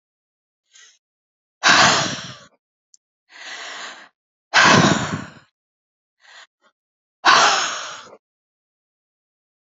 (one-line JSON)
{"exhalation_length": "9.6 s", "exhalation_amplitude": 32767, "exhalation_signal_mean_std_ratio": 0.34, "survey_phase": "alpha (2021-03-01 to 2021-08-12)", "age": "65+", "gender": "Female", "wearing_mask": "No", "symptom_none": true, "smoker_status": "Never smoked", "respiratory_condition_asthma": false, "respiratory_condition_other": false, "recruitment_source": "REACT", "submission_delay": "1 day", "covid_test_result": "Negative", "covid_test_method": "RT-qPCR"}